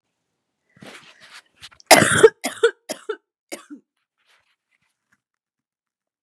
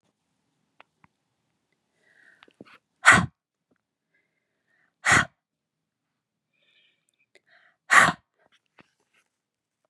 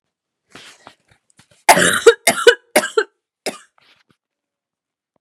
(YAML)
cough_length: 6.2 s
cough_amplitude: 32768
cough_signal_mean_std_ratio: 0.22
exhalation_length: 9.9 s
exhalation_amplitude: 31195
exhalation_signal_mean_std_ratio: 0.18
three_cough_length: 5.2 s
three_cough_amplitude: 32768
three_cough_signal_mean_std_ratio: 0.28
survey_phase: beta (2021-08-13 to 2022-03-07)
age: 18-44
gender: Female
wearing_mask: 'No'
symptom_cough_any: true
symptom_runny_or_blocked_nose: true
symptom_sore_throat: true
symptom_fever_high_temperature: true
symptom_headache: true
symptom_onset: 3 days
smoker_status: Never smoked
respiratory_condition_asthma: false
respiratory_condition_other: false
recruitment_source: Test and Trace
submission_delay: 2 days
covid_test_result: Positive
covid_test_method: RT-qPCR
covid_ct_value: 18.3
covid_ct_gene: N gene
covid_ct_mean: 18.6
covid_viral_load: 770000 copies/ml
covid_viral_load_category: Low viral load (10K-1M copies/ml)